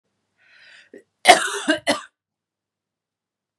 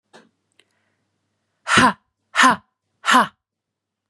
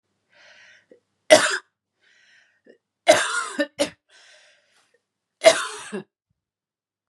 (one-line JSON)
{"cough_length": "3.6 s", "cough_amplitude": 32768, "cough_signal_mean_std_ratio": 0.25, "exhalation_length": "4.1 s", "exhalation_amplitude": 32424, "exhalation_signal_mean_std_ratio": 0.31, "three_cough_length": "7.1 s", "three_cough_amplitude": 32631, "three_cough_signal_mean_std_ratio": 0.26, "survey_phase": "beta (2021-08-13 to 2022-03-07)", "age": "18-44", "gender": "Female", "wearing_mask": "No", "symptom_cough_any": true, "symptom_runny_or_blocked_nose": true, "smoker_status": "Never smoked", "respiratory_condition_asthma": false, "respiratory_condition_other": false, "recruitment_source": "Test and Trace", "submission_delay": "2 days", "covid_test_result": "Positive", "covid_test_method": "LFT"}